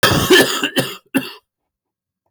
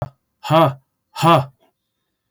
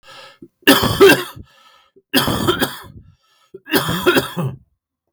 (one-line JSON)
{"cough_length": "2.3 s", "cough_amplitude": 27293, "cough_signal_mean_std_ratio": 0.5, "exhalation_length": "2.3 s", "exhalation_amplitude": 27389, "exhalation_signal_mean_std_ratio": 0.38, "three_cough_length": "5.1 s", "three_cough_amplitude": 32768, "three_cough_signal_mean_std_ratio": 0.45, "survey_phase": "beta (2021-08-13 to 2022-03-07)", "age": "45-64", "gender": "Male", "wearing_mask": "No", "symptom_cough_any": true, "symptom_runny_or_blocked_nose": true, "symptom_sore_throat": true, "smoker_status": "Never smoked", "respiratory_condition_asthma": false, "respiratory_condition_other": false, "recruitment_source": "REACT", "submission_delay": "3 days", "covid_test_result": "Negative", "covid_test_method": "RT-qPCR", "influenza_a_test_result": "Negative", "influenza_b_test_result": "Negative"}